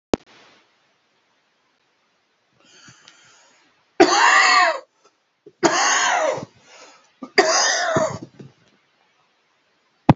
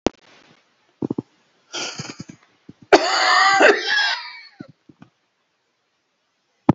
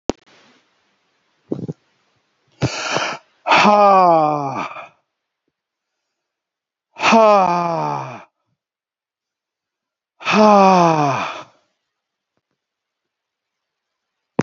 {"three_cough_length": "10.2 s", "three_cough_amplitude": 32767, "three_cough_signal_mean_std_ratio": 0.39, "cough_length": "6.7 s", "cough_amplitude": 28693, "cough_signal_mean_std_ratio": 0.37, "exhalation_length": "14.4 s", "exhalation_amplitude": 32767, "exhalation_signal_mean_std_ratio": 0.39, "survey_phase": "beta (2021-08-13 to 2022-03-07)", "age": "45-64", "gender": "Male", "wearing_mask": "No", "symptom_none": true, "smoker_status": "Never smoked", "respiratory_condition_asthma": true, "respiratory_condition_other": false, "recruitment_source": "REACT", "submission_delay": "2 days", "covid_test_result": "Negative", "covid_test_method": "RT-qPCR", "influenza_a_test_result": "Negative", "influenza_b_test_result": "Negative"}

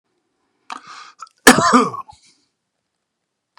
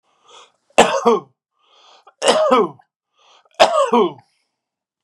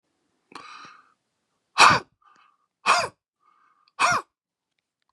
{"cough_length": "3.6 s", "cough_amplitude": 32768, "cough_signal_mean_std_ratio": 0.27, "three_cough_length": "5.0 s", "three_cough_amplitude": 32768, "three_cough_signal_mean_std_ratio": 0.4, "exhalation_length": "5.1 s", "exhalation_amplitude": 31557, "exhalation_signal_mean_std_ratio": 0.27, "survey_phase": "beta (2021-08-13 to 2022-03-07)", "age": "45-64", "gender": "Male", "wearing_mask": "No", "symptom_none": true, "smoker_status": "Never smoked", "respiratory_condition_asthma": false, "respiratory_condition_other": false, "recruitment_source": "REACT", "submission_delay": "0 days", "covid_test_result": "Negative", "covid_test_method": "RT-qPCR", "influenza_a_test_result": "Negative", "influenza_b_test_result": "Negative"}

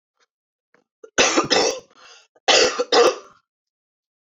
{"cough_length": "4.3 s", "cough_amplitude": 25529, "cough_signal_mean_std_ratio": 0.41, "survey_phase": "alpha (2021-03-01 to 2021-08-12)", "age": "18-44", "gender": "Female", "wearing_mask": "No", "symptom_fatigue": true, "symptom_headache": true, "symptom_change_to_sense_of_smell_or_taste": true, "symptom_loss_of_taste": true, "symptom_onset": "8 days", "smoker_status": "Never smoked", "respiratory_condition_asthma": true, "respiratory_condition_other": false, "recruitment_source": "Test and Trace", "submission_delay": "2 days", "covid_test_result": "Positive", "covid_test_method": "RT-qPCR", "covid_ct_value": 15.5, "covid_ct_gene": "ORF1ab gene", "covid_ct_mean": 15.6, "covid_viral_load": "7900000 copies/ml", "covid_viral_load_category": "High viral load (>1M copies/ml)"}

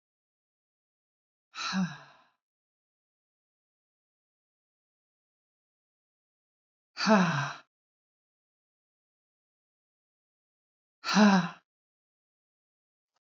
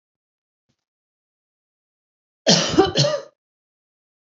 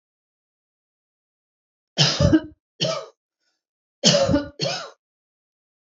{"exhalation_length": "13.2 s", "exhalation_amplitude": 10960, "exhalation_signal_mean_std_ratio": 0.23, "cough_length": "4.4 s", "cough_amplitude": 29995, "cough_signal_mean_std_ratio": 0.29, "three_cough_length": "6.0 s", "three_cough_amplitude": 25374, "three_cough_signal_mean_std_ratio": 0.35, "survey_phase": "beta (2021-08-13 to 2022-03-07)", "age": "18-44", "gender": "Female", "wearing_mask": "No", "symptom_none": true, "smoker_status": "Ex-smoker", "respiratory_condition_asthma": false, "respiratory_condition_other": false, "recruitment_source": "REACT", "submission_delay": "6 days", "covid_test_result": "Negative", "covid_test_method": "RT-qPCR", "influenza_a_test_result": "Unknown/Void", "influenza_b_test_result": "Unknown/Void"}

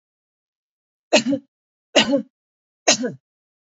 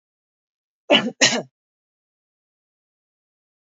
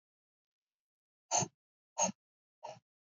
{"three_cough_length": "3.7 s", "three_cough_amplitude": 29240, "three_cough_signal_mean_std_ratio": 0.32, "cough_length": "3.7 s", "cough_amplitude": 27660, "cough_signal_mean_std_ratio": 0.23, "exhalation_length": "3.2 s", "exhalation_amplitude": 3995, "exhalation_signal_mean_std_ratio": 0.24, "survey_phase": "alpha (2021-03-01 to 2021-08-12)", "age": "45-64", "gender": "Female", "wearing_mask": "No", "symptom_none": true, "smoker_status": "Ex-smoker", "respiratory_condition_asthma": false, "respiratory_condition_other": false, "recruitment_source": "REACT", "submission_delay": "1 day", "covid_test_result": "Negative", "covid_test_method": "RT-qPCR"}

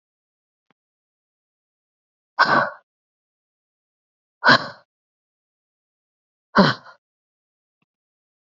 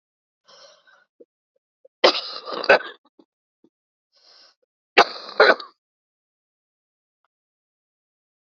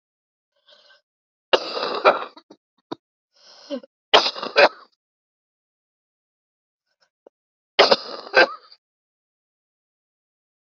{"exhalation_length": "8.4 s", "exhalation_amplitude": 29968, "exhalation_signal_mean_std_ratio": 0.21, "cough_length": "8.4 s", "cough_amplitude": 32767, "cough_signal_mean_std_ratio": 0.2, "three_cough_length": "10.8 s", "three_cough_amplitude": 30949, "three_cough_signal_mean_std_ratio": 0.24, "survey_phase": "alpha (2021-03-01 to 2021-08-12)", "age": "18-44", "gender": "Female", "wearing_mask": "No", "symptom_cough_any": true, "symptom_fatigue": true, "symptom_headache": true, "symptom_change_to_sense_of_smell_or_taste": true, "symptom_loss_of_taste": true, "symptom_onset": "4 days", "smoker_status": "Never smoked", "respiratory_condition_asthma": false, "respiratory_condition_other": false, "recruitment_source": "Test and Trace", "submission_delay": "1 day", "covid_test_result": "Positive", "covid_test_method": "RT-qPCR"}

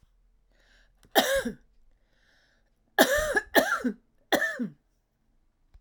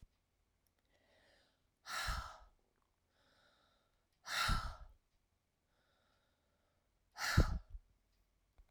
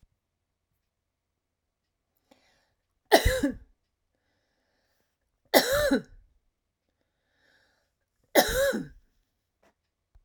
{"cough_length": "5.8 s", "cough_amplitude": 19587, "cough_signal_mean_std_ratio": 0.38, "exhalation_length": "8.7 s", "exhalation_amplitude": 3917, "exhalation_signal_mean_std_ratio": 0.28, "three_cough_length": "10.2 s", "three_cough_amplitude": 28198, "three_cough_signal_mean_std_ratio": 0.26, "survey_phase": "alpha (2021-03-01 to 2021-08-12)", "age": "65+", "gender": "Female", "wearing_mask": "No", "symptom_fatigue": true, "symptom_onset": "12 days", "smoker_status": "Ex-smoker", "respiratory_condition_asthma": false, "respiratory_condition_other": false, "recruitment_source": "REACT", "submission_delay": "1 day", "covid_test_result": "Negative", "covid_test_method": "RT-qPCR"}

